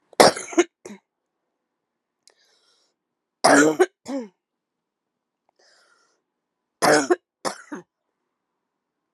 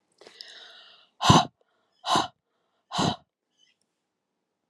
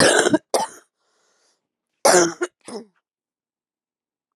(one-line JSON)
{"three_cough_length": "9.1 s", "three_cough_amplitude": 32767, "three_cough_signal_mean_std_ratio": 0.26, "exhalation_length": "4.7 s", "exhalation_amplitude": 22734, "exhalation_signal_mean_std_ratio": 0.27, "cough_length": "4.4 s", "cough_amplitude": 32177, "cough_signal_mean_std_ratio": 0.34, "survey_phase": "alpha (2021-03-01 to 2021-08-12)", "age": "45-64", "gender": "Female", "wearing_mask": "No", "symptom_cough_any": true, "symptom_shortness_of_breath": true, "symptom_diarrhoea": true, "symptom_fatigue": true, "symptom_headache": true, "symptom_onset": "5 days", "smoker_status": "Ex-smoker", "respiratory_condition_asthma": false, "respiratory_condition_other": false, "recruitment_source": "Test and Trace", "submission_delay": "1 day", "covid_test_result": "Positive", "covid_test_method": "RT-qPCR", "covid_ct_value": 15.3, "covid_ct_gene": "N gene", "covid_ct_mean": 16.0, "covid_viral_load": "5600000 copies/ml", "covid_viral_load_category": "High viral load (>1M copies/ml)"}